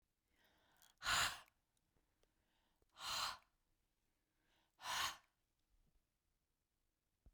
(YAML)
exhalation_length: 7.3 s
exhalation_amplitude: 1658
exhalation_signal_mean_std_ratio: 0.29
survey_phase: beta (2021-08-13 to 2022-03-07)
age: 45-64
gender: Female
wearing_mask: 'No'
symptom_none: true
smoker_status: Ex-smoker
respiratory_condition_asthma: false
respiratory_condition_other: false
recruitment_source: REACT
submission_delay: 3 days
covid_test_result: Negative
covid_test_method: RT-qPCR